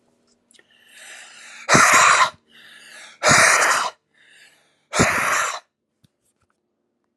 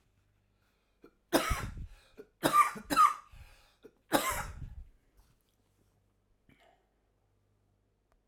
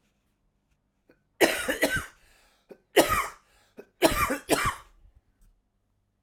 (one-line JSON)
{"exhalation_length": "7.2 s", "exhalation_amplitude": 32767, "exhalation_signal_mean_std_ratio": 0.43, "three_cough_length": "8.3 s", "three_cough_amplitude": 12770, "three_cough_signal_mean_std_ratio": 0.3, "cough_length": "6.2 s", "cough_amplitude": 25145, "cough_signal_mean_std_ratio": 0.36, "survey_phase": "alpha (2021-03-01 to 2021-08-12)", "age": "18-44", "gender": "Male", "wearing_mask": "No", "symptom_cough_any": true, "symptom_new_continuous_cough": true, "symptom_shortness_of_breath": true, "symptom_fatigue": true, "symptom_onset": "2 days", "smoker_status": "Ex-smoker", "respiratory_condition_asthma": true, "respiratory_condition_other": false, "recruitment_source": "Test and Trace", "submission_delay": "1 day", "covid_test_result": "Positive", "covid_test_method": "RT-qPCR", "covid_ct_value": 17.2, "covid_ct_gene": "ORF1ab gene", "covid_ct_mean": 18.3, "covid_viral_load": "1000000 copies/ml", "covid_viral_load_category": "High viral load (>1M copies/ml)"}